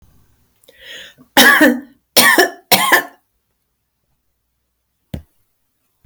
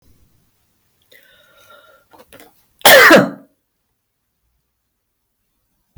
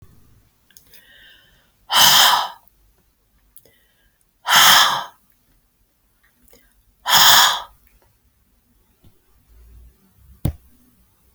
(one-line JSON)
{"three_cough_length": "6.1 s", "three_cough_amplitude": 32768, "three_cough_signal_mean_std_ratio": 0.35, "cough_length": "6.0 s", "cough_amplitude": 32768, "cough_signal_mean_std_ratio": 0.24, "exhalation_length": "11.3 s", "exhalation_amplitude": 32768, "exhalation_signal_mean_std_ratio": 0.31, "survey_phase": "beta (2021-08-13 to 2022-03-07)", "age": "65+", "gender": "Female", "wearing_mask": "No", "symptom_none": true, "smoker_status": "Ex-smoker", "respiratory_condition_asthma": false, "respiratory_condition_other": false, "recruitment_source": "REACT", "submission_delay": "1 day", "covid_test_result": "Negative", "covid_test_method": "RT-qPCR"}